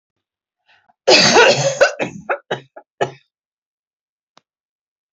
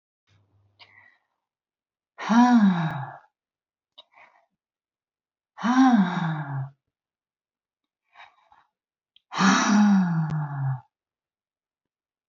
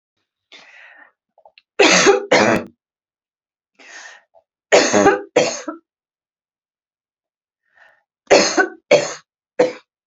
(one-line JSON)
{"cough_length": "5.1 s", "cough_amplitude": 32768, "cough_signal_mean_std_ratio": 0.35, "exhalation_length": "12.3 s", "exhalation_amplitude": 15695, "exhalation_signal_mean_std_ratio": 0.41, "three_cough_length": "10.1 s", "three_cough_amplitude": 32523, "three_cough_signal_mean_std_ratio": 0.36, "survey_phase": "beta (2021-08-13 to 2022-03-07)", "age": "45-64", "gender": "Female", "wearing_mask": "No", "symptom_none": true, "smoker_status": "Ex-smoker", "respiratory_condition_asthma": false, "respiratory_condition_other": false, "recruitment_source": "REACT", "submission_delay": "3 days", "covid_test_result": "Negative", "covid_test_method": "RT-qPCR", "influenza_a_test_result": "Negative", "influenza_b_test_result": "Negative"}